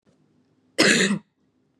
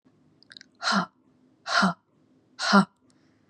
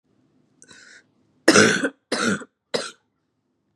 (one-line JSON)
{"cough_length": "1.8 s", "cough_amplitude": 25023, "cough_signal_mean_std_ratio": 0.38, "exhalation_length": "3.5 s", "exhalation_amplitude": 21527, "exhalation_signal_mean_std_ratio": 0.34, "three_cough_length": "3.8 s", "three_cough_amplitude": 32767, "three_cough_signal_mean_std_ratio": 0.33, "survey_phase": "beta (2021-08-13 to 2022-03-07)", "age": "18-44", "gender": "Female", "wearing_mask": "No", "symptom_cough_any": true, "symptom_new_continuous_cough": true, "symptom_shortness_of_breath": true, "symptom_sore_throat": true, "symptom_onset": "2 days", "smoker_status": "Never smoked", "respiratory_condition_asthma": false, "respiratory_condition_other": false, "recruitment_source": "Test and Trace", "submission_delay": "1 day", "covid_test_result": "Positive", "covid_test_method": "RT-qPCR", "covid_ct_value": 26.6, "covid_ct_gene": "N gene"}